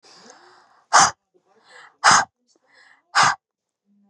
exhalation_length: 4.1 s
exhalation_amplitude: 29835
exhalation_signal_mean_std_ratio: 0.3
survey_phase: beta (2021-08-13 to 2022-03-07)
age: 18-44
gender: Female
wearing_mask: 'No'
symptom_none: true
symptom_onset: 3 days
smoker_status: Ex-smoker
respiratory_condition_asthma: false
respiratory_condition_other: false
recruitment_source: REACT
submission_delay: 4 days
covid_test_result: Negative
covid_test_method: RT-qPCR
influenza_a_test_result: Unknown/Void
influenza_b_test_result: Unknown/Void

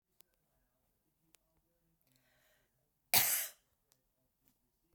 cough_length: 4.9 s
cough_amplitude: 9631
cough_signal_mean_std_ratio: 0.19
survey_phase: beta (2021-08-13 to 2022-03-07)
age: 65+
gender: Female
wearing_mask: 'No'
symptom_none: true
smoker_status: Never smoked
respiratory_condition_asthma: false
respiratory_condition_other: false
recruitment_source: REACT
submission_delay: 0 days
covid_test_result: Negative
covid_test_method: RT-qPCR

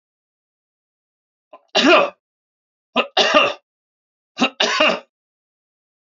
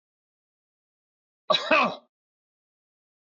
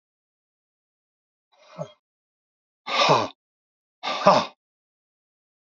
three_cough_length: 6.1 s
three_cough_amplitude: 27831
three_cough_signal_mean_std_ratio: 0.35
cough_length: 3.2 s
cough_amplitude: 14021
cough_signal_mean_std_ratio: 0.26
exhalation_length: 5.7 s
exhalation_amplitude: 27519
exhalation_signal_mean_std_ratio: 0.27
survey_phase: alpha (2021-03-01 to 2021-08-12)
age: 65+
gender: Male
wearing_mask: 'No'
symptom_none: true
smoker_status: Ex-smoker
respiratory_condition_asthma: false
respiratory_condition_other: false
recruitment_source: REACT
submission_delay: 2 days
covid_test_result: Negative
covid_test_method: RT-qPCR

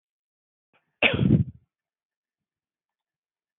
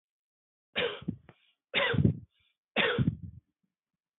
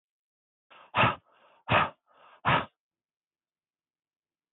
cough_length: 3.6 s
cough_amplitude: 18755
cough_signal_mean_std_ratio: 0.25
three_cough_length: 4.2 s
three_cough_amplitude: 8458
three_cough_signal_mean_std_ratio: 0.4
exhalation_length: 4.5 s
exhalation_amplitude: 9709
exhalation_signal_mean_std_ratio: 0.28
survey_phase: beta (2021-08-13 to 2022-03-07)
age: 18-44
gender: Male
wearing_mask: 'No'
symptom_none: true
smoker_status: Never smoked
respiratory_condition_asthma: false
respiratory_condition_other: false
recruitment_source: REACT
submission_delay: 1 day
covid_test_result: Negative
covid_test_method: RT-qPCR
influenza_a_test_result: Negative
influenza_b_test_result: Negative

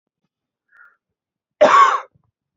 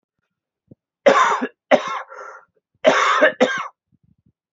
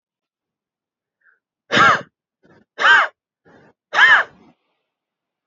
cough_length: 2.6 s
cough_amplitude: 32118
cough_signal_mean_std_ratio: 0.32
three_cough_length: 4.5 s
three_cough_amplitude: 32390
three_cough_signal_mean_std_ratio: 0.42
exhalation_length: 5.5 s
exhalation_amplitude: 27320
exhalation_signal_mean_std_ratio: 0.32
survey_phase: beta (2021-08-13 to 2022-03-07)
age: 18-44
gender: Male
wearing_mask: 'No'
symptom_cough_any: true
symptom_sore_throat: true
symptom_onset: 1 day
smoker_status: Never smoked
respiratory_condition_asthma: false
respiratory_condition_other: false
recruitment_source: Test and Trace
submission_delay: 1 day
covid_test_result: Negative
covid_test_method: ePCR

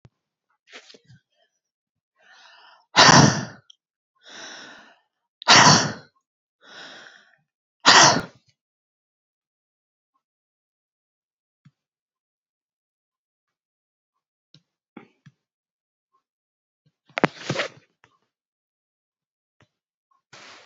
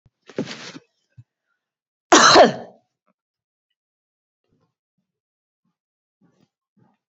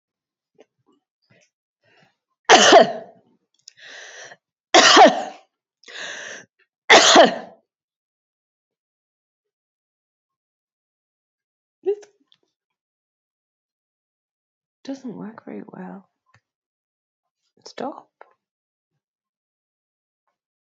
exhalation_length: 20.7 s
exhalation_amplitude: 32768
exhalation_signal_mean_std_ratio: 0.2
cough_length: 7.1 s
cough_amplitude: 30504
cough_signal_mean_std_ratio: 0.2
three_cough_length: 20.7 s
three_cough_amplitude: 31415
three_cough_signal_mean_std_ratio: 0.22
survey_phase: beta (2021-08-13 to 2022-03-07)
age: 45-64
gender: Female
wearing_mask: 'No'
symptom_none: true
smoker_status: Never smoked
respiratory_condition_asthma: false
respiratory_condition_other: false
recruitment_source: REACT
submission_delay: 2 days
covid_test_result: Negative
covid_test_method: RT-qPCR
influenza_a_test_result: Negative
influenza_b_test_result: Negative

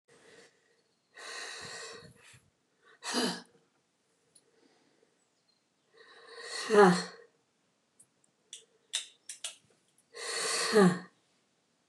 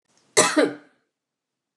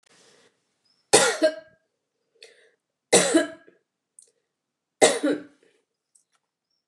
exhalation_length: 11.9 s
exhalation_amplitude: 12463
exhalation_signal_mean_std_ratio: 0.28
cough_length: 1.8 s
cough_amplitude: 27624
cough_signal_mean_std_ratio: 0.33
three_cough_length: 6.9 s
three_cough_amplitude: 29182
three_cough_signal_mean_std_ratio: 0.29
survey_phase: beta (2021-08-13 to 2022-03-07)
age: 65+
gender: Female
wearing_mask: 'No'
symptom_prefer_not_to_say: true
smoker_status: Never smoked
respiratory_condition_asthma: false
respiratory_condition_other: false
recruitment_source: REACT
submission_delay: 4 days
covid_test_result: Negative
covid_test_method: RT-qPCR
influenza_a_test_result: Negative
influenza_b_test_result: Negative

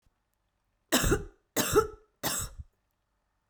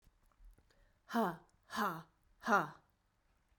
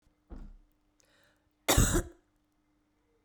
three_cough_length: 3.5 s
three_cough_amplitude: 10163
three_cough_signal_mean_std_ratio: 0.38
exhalation_length: 3.6 s
exhalation_amplitude: 4081
exhalation_signal_mean_std_ratio: 0.35
cough_length: 3.2 s
cough_amplitude: 10725
cough_signal_mean_std_ratio: 0.28
survey_phase: beta (2021-08-13 to 2022-03-07)
age: 18-44
gender: Female
wearing_mask: 'No'
symptom_runny_or_blocked_nose: true
symptom_fatigue: true
symptom_fever_high_temperature: true
symptom_onset: 3 days
smoker_status: Never smoked
respiratory_condition_asthma: false
respiratory_condition_other: false
recruitment_source: Test and Trace
submission_delay: 1 day
covid_test_result: Positive
covid_test_method: RT-qPCR
covid_ct_value: 16.5
covid_ct_gene: ORF1ab gene
covid_ct_mean: 17.4
covid_viral_load: 2000000 copies/ml
covid_viral_load_category: High viral load (>1M copies/ml)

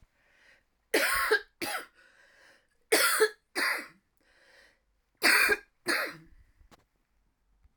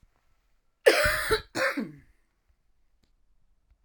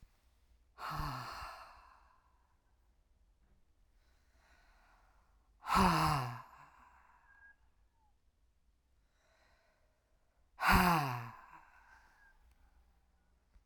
three_cough_length: 7.8 s
three_cough_amplitude: 10818
three_cough_signal_mean_std_ratio: 0.39
cough_length: 3.8 s
cough_amplitude: 22280
cough_signal_mean_std_ratio: 0.34
exhalation_length: 13.7 s
exhalation_amplitude: 8200
exhalation_signal_mean_std_ratio: 0.3
survey_phase: alpha (2021-03-01 to 2021-08-12)
age: 45-64
gender: Female
wearing_mask: 'No'
symptom_none: true
smoker_status: Ex-smoker
respiratory_condition_asthma: false
respiratory_condition_other: false
recruitment_source: REACT
submission_delay: 2 days
covid_test_result: Negative
covid_test_method: RT-qPCR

